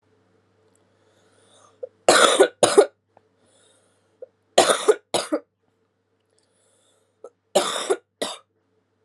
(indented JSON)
{
  "three_cough_length": "9.0 s",
  "three_cough_amplitude": 32724,
  "three_cough_signal_mean_std_ratio": 0.29,
  "survey_phase": "alpha (2021-03-01 to 2021-08-12)",
  "age": "18-44",
  "gender": "Female",
  "wearing_mask": "No",
  "symptom_cough_any": true,
  "symptom_shortness_of_breath": true,
  "symptom_fatigue": true,
  "symptom_headache": true,
  "symptom_change_to_sense_of_smell_or_taste": true,
  "symptom_onset": "3 days",
  "smoker_status": "Current smoker (1 to 10 cigarettes per day)",
  "respiratory_condition_asthma": false,
  "respiratory_condition_other": false,
  "recruitment_source": "Test and Trace",
  "submission_delay": "2 days",
  "covid_test_result": "Positive",
  "covid_test_method": "RT-qPCR",
  "covid_ct_value": 25.5,
  "covid_ct_gene": "N gene"
}